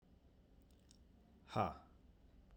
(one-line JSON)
{"exhalation_length": "2.6 s", "exhalation_amplitude": 1911, "exhalation_signal_mean_std_ratio": 0.32, "survey_phase": "beta (2021-08-13 to 2022-03-07)", "age": "18-44", "gender": "Male", "wearing_mask": "No", "symptom_none": true, "smoker_status": "Ex-smoker", "respiratory_condition_asthma": false, "respiratory_condition_other": false, "recruitment_source": "REACT", "submission_delay": "1 day", "covid_test_result": "Negative", "covid_test_method": "RT-qPCR"}